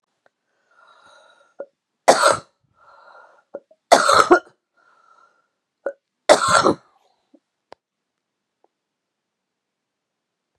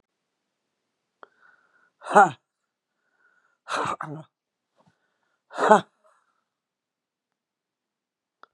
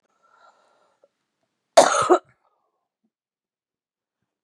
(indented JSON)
{
  "three_cough_length": "10.6 s",
  "three_cough_amplitude": 32768,
  "three_cough_signal_mean_std_ratio": 0.25,
  "exhalation_length": "8.5 s",
  "exhalation_amplitude": 31222,
  "exhalation_signal_mean_std_ratio": 0.18,
  "cough_length": "4.4 s",
  "cough_amplitude": 31735,
  "cough_signal_mean_std_ratio": 0.21,
  "survey_phase": "beta (2021-08-13 to 2022-03-07)",
  "age": "65+",
  "gender": "Female",
  "wearing_mask": "No",
  "symptom_cough_any": true,
  "symptom_runny_or_blocked_nose": true,
  "symptom_loss_of_taste": true,
  "symptom_onset": "8 days",
  "smoker_status": "Ex-smoker",
  "respiratory_condition_asthma": false,
  "respiratory_condition_other": false,
  "recruitment_source": "REACT",
  "submission_delay": "1 day",
  "covid_test_result": "Negative",
  "covid_test_method": "RT-qPCR"
}